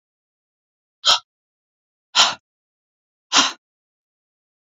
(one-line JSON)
{"exhalation_length": "4.7 s", "exhalation_amplitude": 32768, "exhalation_signal_mean_std_ratio": 0.24, "survey_phase": "beta (2021-08-13 to 2022-03-07)", "age": "45-64", "gender": "Female", "wearing_mask": "No", "symptom_none": true, "smoker_status": "Never smoked", "respiratory_condition_asthma": false, "respiratory_condition_other": false, "recruitment_source": "REACT", "submission_delay": "1 day", "covid_test_result": "Negative", "covid_test_method": "RT-qPCR"}